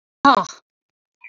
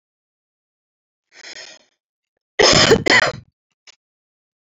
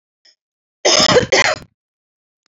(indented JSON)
{
  "exhalation_length": "1.3 s",
  "exhalation_amplitude": 27931,
  "exhalation_signal_mean_std_ratio": 0.29,
  "cough_length": "4.6 s",
  "cough_amplitude": 32574,
  "cough_signal_mean_std_ratio": 0.3,
  "three_cough_length": "2.5 s",
  "three_cough_amplitude": 31350,
  "three_cough_signal_mean_std_ratio": 0.41,
  "survey_phase": "beta (2021-08-13 to 2022-03-07)",
  "age": "45-64",
  "gender": "Female",
  "wearing_mask": "No",
  "symptom_none": true,
  "smoker_status": "Never smoked",
  "respiratory_condition_asthma": false,
  "respiratory_condition_other": false,
  "recruitment_source": "REACT",
  "submission_delay": "4 days",
  "covid_test_result": "Negative",
  "covid_test_method": "RT-qPCR"
}